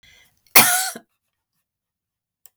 {"cough_length": "2.6 s", "cough_amplitude": 32768, "cough_signal_mean_std_ratio": 0.25, "survey_phase": "beta (2021-08-13 to 2022-03-07)", "age": "45-64", "gender": "Female", "wearing_mask": "No", "symptom_none": true, "smoker_status": "Ex-smoker", "respiratory_condition_asthma": false, "respiratory_condition_other": false, "recruitment_source": "REACT", "submission_delay": "4 days", "covid_test_result": "Negative", "covid_test_method": "RT-qPCR"}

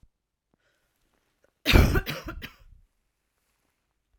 {"cough_length": "4.2 s", "cough_amplitude": 22226, "cough_signal_mean_std_ratio": 0.25, "survey_phase": "alpha (2021-03-01 to 2021-08-12)", "age": "18-44", "gender": "Female", "wearing_mask": "No", "symptom_cough_any": true, "symptom_fatigue": true, "symptom_headache": true, "symptom_change_to_sense_of_smell_or_taste": true, "smoker_status": "Never smoked", "respiratory_condition_asthma": false, "respiratory_condition_other": false, "recruitment_source": "Test and Trace", "submission_delay": "2 days", "covid_test_result": "Positive", "covid_test_method": "RT-qPCR", "covid_ct_value": 15.4, "covid_ct_gene": "ORF1ab gene", "covid_ct_mean": 15.9, "covid_viral_load": "6200000 copies/ml", "covid_viral_load_category": "High viral load (>1M copies/ml)"}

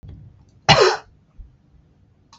{"cough_length": "2.4 s", "cough_amplitude": 32768, "cough_signal_mean_std_ratio": 0.29, "survey_phase": "beta (2021-08-13 to 2022-03-07)", "age": "45-64", "gender": "Female", "wearing_mask": "No", "symptom_headache": true, "symptom_other": true, "smoker_status": "Ex-smoker", "respiratory_condition_asthma": false, "respiratory_condition_other": false, "recruitment_source": "REACT", "submission_delay": "2 days", "covid_test_result": "Negative", "covid_test_method": "RT-qPCR", "influenza_a_test_result": "Negative", "influenza_b_test_result": "Negative"}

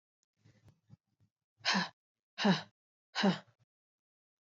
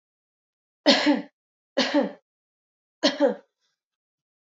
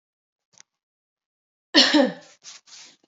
{"exhalation_length": "4.5 s", "exhalation_amplitude": 4526, "exhalation_signal_mean_std_ratio": 0.29, "three_cough_length": "4.5 s", "three_cough_amplitude": 21131, "three_cough_signal_mean_std_ratio": 0.34, "cough_length": "3.1 s", "cough_amplitude": 26695, "cough_signal_mean_std_ratio": 0.27, "survey_phase": "beta (2021-08-13 to 2022-03-07)", "age": "18-44", "gender": "Female", "wearing_mask": "No", "symptom_cough_any": true, "symptom_runny_or_blocked_nose": true, "symptom_shortness_of_breath": true, "symptom_sore_throat": true, "symptom_fatigue": true, "symptom_fever_high_temperature": true, "symptom_headache": true, "symptom_onset": "4 days", "smoker_status": "Never smoked", "respiratory_condition_asthma": false, "respiratory_condition_other": false, "recruitment_source": "Test and Trace", "submission_delay": "2 days", "covid_test_result": "Positive", "covid_test_method": "RT-qPCR", "covid_ct_value": 31.9, "covid_ct_gene": "ORF1ab gene", "covid_ct_mean": 32.2, "covid_viral_load": "27 copies/ml", "covid_viral_load_category": "Minimal viral load (< 10K copies/ml)"}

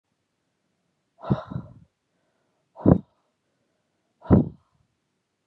{"exhalation_length": "5.5 s", "exhalation_amplitude": 25604, "exhalation_signal_mean_std_ratio": 0.21, "survey_phase": "beta (2021-08-13 to 2022-03-07)", "age": "18-44", "gender": "Female", "wearing_mask": "No", "symptom_cough_any": true, "symptom_new_continuous_cough": true, "symptom_runny_or_blocked_nose": true, "symptom_sore_throat": true, "symptom_fatigue": true, "symptom_fever_high_temperature": true, "symptom_headache": true, "symptom_onset": "4 days", "smoker_status": "Never smoked", "respiratory_condition_asthma": false, "respiratory_condition_other": false, "recruitment_source": "Test and Trace", "submission_delay": "1 day", "covid_test_result": "Positive", "covid_test_method": "ePCR"}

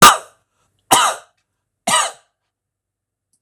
{"three_cough_length": "3.4 s", "three_cough_amplitude": 26028, "three_cough_signal_mean_std_ratio": 0.31, "survey_phase": "beta (2021-08-13 to 2022-03-07)", "age": "45-64", "gender": "Male", "wearing_mask": "No", "symptom_runny_or_blocked_nose": true, "smoker_status": "Never smoked", "respiratory_condition_asthma": false, "respiratory_condition_other": false, "recruitment_source": "REACT", "submission_delay": "1 day", "covid_test_result": "Negative", "covid_test_method": "RT-qPCR", "influenza_a_test_result": "Negative", "influenza_b_test_result": "Negative"}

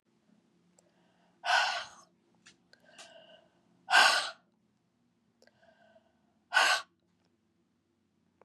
{"exhalation_length": "8.4 s", "exhalation_amplitude": 9906, "exhalation_signal_mean_std_ratio": 0.27, "survey_phase": "beta (2021-08-13 to 2022-03-07)", "age": "45-64", "gender": "Female", "wearing_mask": "No", "symptom_cough_any": true, "symptom_runny_or_blocked_nose": true, "symptom_fatigue": true, "symptom_headache": true, "symptom_change_to_sense_of_smell_or_taste": true, "symptom_onset": "2 days", "smoker_status": "Never smoked", "respiratory_condition_asthma": false, "respiratory_condition_other": false, "recruitment_source": "Test and Trace", "submission_delay": "2 days", "covid_test_result": "Positive", "covid_test_method": "RT-qPCR", "covid_ct_value": 14.9, "covid_ct_gene": "ORF1ab gene", "covid_ct_mean": 15.3, "covid_viral_load": "9800000 copies/ml", "covid_viral_load_category": "High viral load (>1M copies/ml)"}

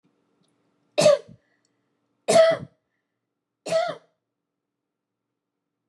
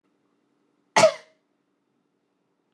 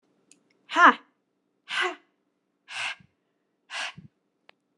{"three_cough_length": "5.9 s", "three_cough_amplitude": 17661, "three_cough_signal_mean_std_ratio": 0.28, "cough_length": "2.7 s", "cough_amplitude": 20265, "cough_signal_mean_std_ratio": 0.19, "exhalation_length": "4.8 s", "exhalation_amplitude": 25717, "exhalation_signal_mean_std_ratio": 0.23, "survey_phase": "beta (2021-08-13 to 2022-03-07)", "age": "18-44", "gender": "Female", "wearing_mask": "No", "symptom_none": true, "smoker_status": "Never smoked", "respiratory_condition_asthma": false, "respiratory_condition_other": false, "recruitment_source": "REACT", "submission_delay": "0 days", "covid_test_result": "Negative", "covid_test_method": "RT-qPCR"}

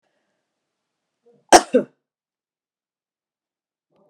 {"cough_length": "4.1 s", "cough_amplitude": 32768, "cough_signal_mean_std_ratio": 0.14, "survey_phase": "beta (2021-08-13 to 2022-03-07)", "age": "65+", "gender": "Female", "wearing_mask": "No", "symptom_cough_any": true, "symptom_runny_or_blocked_nose": true, "symptom_fatigue": true, "symptom_fever_high_temperature": true, "symptom_headache": true, "symptom_change_to_sense_of_smell_or_taste": true, "symptom_onset": "3 days", "smoker_status": "Never smoked", "respiratory_condition_asthma": false, "respiratory_condition_other": false, "recruitment_source": "Test and Trace", "submission_delay": "1 day", "covid_test_result": "Positive", "covid_test_method": "LAMP"}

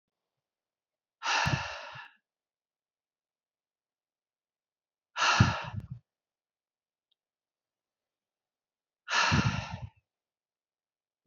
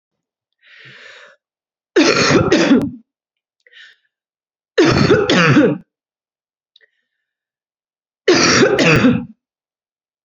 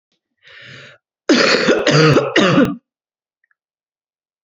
{"exhalation_length": "11.3 s", "exhalation_amplitude": 12921, "exhalation_signal_mean_std_ratio": 0.29, "three_cough_length": "10.2 s", "three_cough_amplitude": 32691, "three_cough_signal_mean_std_ratio": 0.46, "cough_length": "4.4 s", "cough_amplitude": 32767, "cough_signal_mean_std_ratio": 0.48, "survey_phase": "beta (2021-08-13 to 2022-03-07)", "age": "18-44", "gender": "Female", "wearing_mask": "No", "symptom_cough_any": true, "symptom_runny_or_blocked_nose": true, "symptom_sore_throat": true, "symptom_onset": "3 days", "smoker_status": "Never smoked", "respiratory_condition_asthma": false, "respiratory_condition_other": false, "recruitment_source": "Test and Trace", "submission_delay": "2 days", "covid_test_result": "Positive", "covid_test_method": "LAMP"}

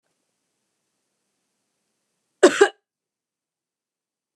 {"cough_length": "4.4 s", "cough_amplitude": 29203, "cough_signal_mean_std_ratio": 0.15, "survey_phase": "beta (2021-08-13 to 2022-03-07)", "age": "45-64", "gender": "Female", "wearing_mask": "No", "symptom_none": true, "smoker_status": "Never smoked", "respiratory_condition_asthma": false, "respiratory_condition_other": false, "recruitment_source": "REACT", "submission_delay": "0 days", "covid_test_result": "Negative", "covid_test_method": "RT-qPCR", "influenza_a_test_result": "Negative", "influenza_b_test_result": "Negative"}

